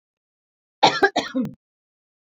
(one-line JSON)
{"cough_length": "2.4 s", "cough_amplitude": 27692, "cough_signal_mean_std_ratio": 0.31, "survey_phase": "beta (2021-08-13 to 2022-03-07)", "age": "45-64", "gender": "Female", "wearing_mask": "No", "symptom_none": true, "smoker_status": "Never smoked", "respiratory_condition_asthma": false, "respiratory_condition_other": false, "recruitment_source": "REACT", "submission_delay": "3 days", "covid_test_result": "Negative", "covid_test_method": "RT-qPCR", "influenza_a_test_result": "Negative", "influenza_b_test_result": "Negative"}